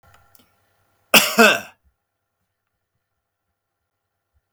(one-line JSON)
{"cough_length": "4.5 s", "cough_amplitude": 32768, "cough_signal_mean_std_ratio": 0.22, "survey_phase": "beta (2021-08-13 to 2022-03-07)", "age": "45-64", "gender": "Male", "wearing_mask": "No", "symptom_none": true, "smoker_status": "Never smoked", "respiratory_condition_asthma": false, "respiratory_condition_other": false, "recruitment_source": "REACT", "submission_delay": "1 day", "covid_test_result": "Negative", "covid_test_method": "RT-qPCR", "influenza_a_test_result": "Negative", "influenza_b_test_result": "Negative"}